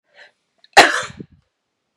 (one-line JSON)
{"cough_length": "2.0 s", "cough_amplitude": 32768, "cough_signal_mean_std_ratio": 0.25, "survey_phase": "beta (2021-08-13 to 2022-03-07)", "age": "45-64", "gender": "Female", "wearing_mask": "No", "symptom_none": true, "smoker_status": "Current smoker (1 to 10 cigarettes per day)", "respiratory_condition_asthma": false, "respiratory_condition_other": false, "recruitment_source": "REACT", "submission_delay": "7 days", "covid_test_result": "Negative", "covid_test_method": "RT-qPCR", "influenza_a_test_result": "Negative", "influenza_b_test_result": "Negative"}